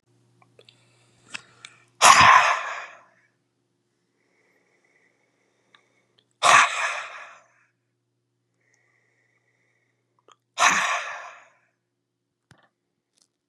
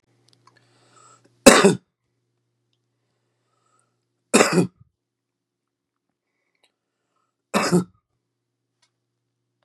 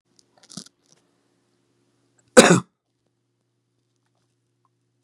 {
  "exhalation_length": "13.5 s",
  "exhalation_amplitude": 31479,
  "exhalation_signal_mean_std_ratio": 0.26,
  "three_cough_length": "9.6 s",
  "three_cough_amplitude": 32768,
  "three_cough_signal_mean_std_ratio": 0.21,
  "cough_length": "5.0 s",
  "cough_amplitude": 32768,
  "cough_signal_mean_std_ratio": 0.16,
  "survey_phase": "beta (2021-08-13 to 2022-03-07)",
  "age": "45-64",
  "gender": "Male",
  "wearing_mask": "No",
  "symptom_headache": true,
  "symptom_onset": "9 days",
  "smoker_status": "Current smoker (1 to 10 cigarettes per day)",
  "respiratory_condition_asthma": true,
  "respiratory_condition_other": false,
  "recruitment_source": "REACT",
  "submission_delay": "1 day",
  "covid_test_result": "Negative",
  "covid_test_method": "RT-qPCR",
  "influenza_a_test_result": "Negative",
  "influenza_b_test_result": "Negative"
}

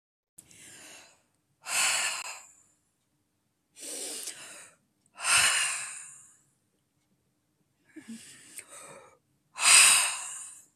{
  "exhalation_length": "10.8 s",
  "exhalation_amplitude": 20616,
  "exhalation_signal_mean_std_ratio": 0.34,
  "survey_phase": "beta (2021-08-13 to 2022-03-07)",
  "age": "65+",
  "gender": "Female",
  "wearing_mask": "No",
  "symptom_none": true,
  "smoker_status": "Never smoked",
  "respiratory_condition_asthma": false,
  "respiratory_condition_other": false,
  "recruitment_source": "REACT",
  "submission_delay": "12 days",
  "covid_test_result": "Negative",
  "covid_test_method": "RT-qPCR"
}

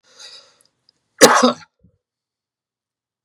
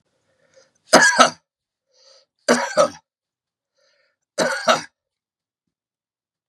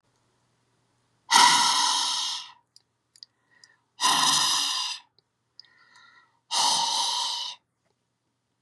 {
  "cough_length": "3.2 s",
  "cough_amplitude": 32768,
  "cough_signal_mean_std_ratio": 0.24,
  "three_cough_length": "6.5 s",
  "three_cough_amplitude": 32768,
  "three_cough_signal_mean_std_ratio": 0.29,
  "exhalation_length": "8.6 s",
  "exhalation_amplitude": 25662,
  "exhalation_signal_mean_std_ratio": 0.47,
  "survey_phase": "beta (2021-08-13 to 2022-03-07)",
  "age": "65+",
  "gender": "Male",
  "wearing_mask": "No",
  "symptom_none": true,
  "symptom_onset": "3 days",
  "smoker_status": "Current smoker (1 to 10 cigarettes per day)",
  "respiratory_condition_asthma": false,
  "respiratory_condition_other": false,
  "recruitment_source": "Test and Trace",
  "submission_delay": "2 days",
  "covid_test_result": "Positive",
  "covid_test_method": "RT-qPCR",
  "covid_ct_value": 16.7,
  "covid_ct_gene": "N gene",
  "covid_ct_mean": 17.6,
  "covid_viral_load": "1700000 copies/ml",
  "covid_viral_load_category": "High viral load (>1M copies/ml)"
}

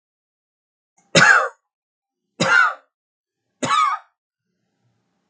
{
  "three_cough_length": "5.3 s",
  "three_cough_amplitude": 32768,
  "three_cough_signal_mean_std_ratio": 0.34,
  "survey_phase": "beta (2021-08-13 to 2022-03-07)",
  "age": "45-64",
  "gender": "Male",
  "wearing_mask": "No",
  "symptom_none": true,
  "smoker_status": "Never smoked",
  "respiratory_condition_asthma": false,
  "respiratory_condition_other": false,
  "recruitment_source": "REACT",
  "submission_delay": "1 day",
  "covid_test_result": "Negative",
  "covid_test_method": "RT-qPCR",
  "influenza_a_test_result": "Negative",
  "influenza_b_test_result": "Negative"
}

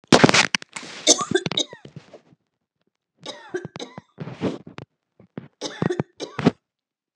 {
  "three_cough_length": "7.2 s",
  "three_cough_amplitude": 32768,
  "three_cough_signal_mean_std_ratio": 0.3,
  "survey_phase": "beta (2021-08-13 to 2022-03-07)",
  "age": "65+",
  "gender": "Female",
  "wearing_mask": "No",
  "symptom_none": true,
  "smoker_status": "Ex-smoker",
  "respiratory_condition_asthma": false,
  "respiratory_condition_other": false,
  "recruitment_source": "REACT",
  "submission_delay": "3 days",
  "covid_test_result": "Negative",
  "covid_test_method": "RT-qPCR",
  "influenza_a_test_result": "Negative",
  "influenza_b_test_result": "Negative"
}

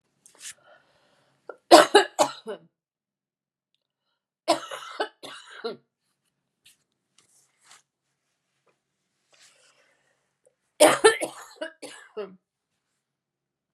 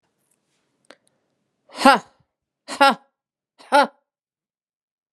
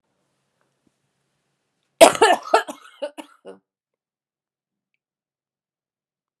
{
  "three_cough_length": "13.7 s",
  "three_cough_amplitude": 32745,
  "three_cough_signal_mean_std_ratio": 0.2,
  "exhalation_length": "5.1 s",
  "exhalation_amplitude": 32767,
  "exhalation_signal_mean_std_ratio": 0.23,
  "cough_length": "6.4 s",
  "cough_amplitude": 32768,
  "cough_signal_mean_std_ratio": 0.19,
  "survey_phase": "alpha (2021-03-01 to 2021-08-12)",
  "age": "45-64",
  "gender": "Female",
  "wearing_mask": "No",
  "symptom_cough_any": true,
  "smoker_status": "Never smoked",
  "respiratory_condition_asthma": true,
  "respiratory_condition_other": false,
  "recruitment_source": "REACT",
  "submission_delay": "1 day",
  "covid_test_result": "Negative",
  "covid_test_method": "RT-qPCR"
}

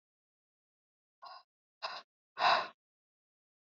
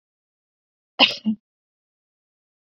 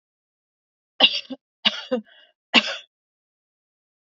{
  "exhalation_length": "3.7 s",
  "exhalation_amplitude": 6122,
  "exhalation_signal_mean_std_ratio": 0.24,
  "cough_length": "2.7 s",
  "cough_amplitude": 31396,
  "cough_signal_mean_std_ratio": 0.2,
  "three_cough_length": "4.0 s",
  "three_cough_amplitude": 28650,
  "three_cough_signal_mean_std_ratio": 0.25,
  "survey_phase": "beta (2021-08-13 to 2022-03-07)",
  "age": "18-44",
  "gender": "Female",
  "wearing_mask": "No",
  "symptom_sore_throat": true,
  "symptom_headache": true,
  "symptom_onset": "3 days",
  "smoker_status": "Never smoked",
  "respiratory_condition_asthma": false,
  "respiratory_condition_other": false,
  "recruitment_source": "REACT",
  "submission_delay": "2 days",
  "covid_test_result": "Negative",
  "covid_test_method": "RT-qPCR",
  "influenza_a_test_result": "Negative",
  "influenza_b_test_result": "Negative"
}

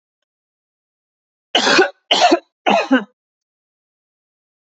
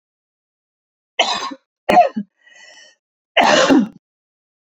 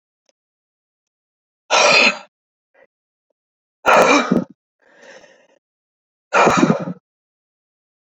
{
  "three_cough_length": "4.7 s",
  "three_cough_amplitude": 29562,
  "three_cough_signal_mean_std_ratio": 0.35,
  "cough_length": "4.8 s",
  "cough_amplitude": 30009,
  "cough_signal_mean_std_ratio": 0.37,
  "exhalation_length": "8.0 s",
  "exhalation_amplitude": 30214,
  "exhalation_signal_mean_std_ratio": 0.35,
  "survey_phase": "alpha (2021-03-01 to 2021-08-12)",
  "age": "45-64",
  "gender": "Female",
  "wearing_mask": "No",
  "symptom_none": true,
  "smoker_status": "Never smoked",
  "respiratory_condition_asthma": false,
  "respiratory_condition_other": false,
  "recruitment_source": "REACT",
  "submission_delay": "1 day",
  "covid_test_result": "Negative",
  "covid_test_method": "RT-qPCR"
}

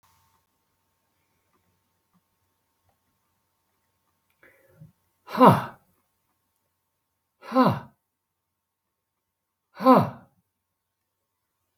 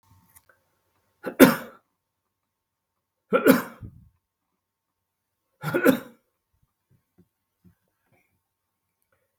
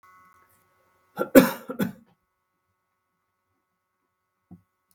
{
  "exhalation_length": "11.8 s",
  "exhalation_amplitude": 28477,
  "exhalation_signal_mean_std_ratio": 0.19,
  "three_cough_length": "9.4 s",
  "three_cough_amplitude": 32768,
  "three_cough_signal_mean_std_ratio": 0.2,
  "cough_length": "4.9 s",
  "cough_amplitude": 32768,
  "cough_signal_mean_std_ratio": 0.17,
  "survey_phase": "beta (2021-08-13 to 2022-03-07)",
  "age": "65+",
  "gender": "Male",
  "wearing_mask": "No",
  "symptom_none": true,
  "smoker_status": "Never smoked",
  "respiratory_condition_asthma": false,
  "respiratory_condition_other": false,
  "recruitment_source": "REACT",
  "submission_delay": "1 day",
  "covid_test_result": "Negative",
  "covid_test_method": "RT-qPCR"
}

